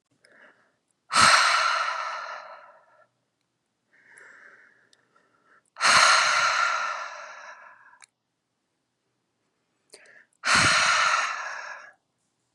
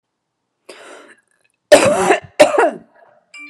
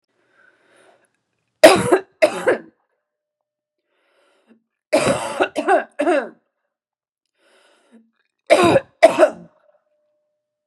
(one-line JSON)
{"exhalation_length": "12.5 s", "exhalation_amplitude": 20872, "exhalation_signal_mean_std_ratio": 0.43, "cough_length": "3.5 s", "cough_amplitude": 32768, "cough_signal_mean_std_ratio": 0.37, "three_cough_length": "10.7 s", "three_cough_amplitude": 32768, "three_cough_signal_mean_std_ratio": 0.32, "survey_phase": "beta (2021-08-13 to 2022-03-07)", "age": "18-44", "gender": "Female", "wearing_mask": "No", "symptom_cough_any": true, "symptom_fatigue": true, "symptom_onset": "6 days", "smoker_status": "Never smoked", "respiratory_condition_asthma": false, "respiratory_condition_other": false, "recruitment_source": "REACT", "submission_delay": "3 days", "covid_test_result": "Negative", "covid_test_method": "RT-qPCR", "influenza_a_test_result": "Negative", "influenza_b_test_result": "Negative"}